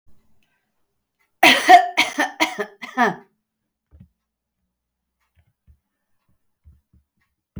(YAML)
cough_length: 7.6 s
cough_amplitude: 31005
cough_signal_mean_std_ratio: 0.25
survey_phase: beta (2021-08-13 to 2022-03-07)
age: 45-64
gender: Female
wearing_mask: 'No'
symptom_none: true
smoker_status: Never smoked
respiratory_condition_asthma: false
respiratory_condition_other: false
recruitment_source: REACT
submission_delay: 0 days
covid_test_result: Negative
covid_test_method: RT-qPCR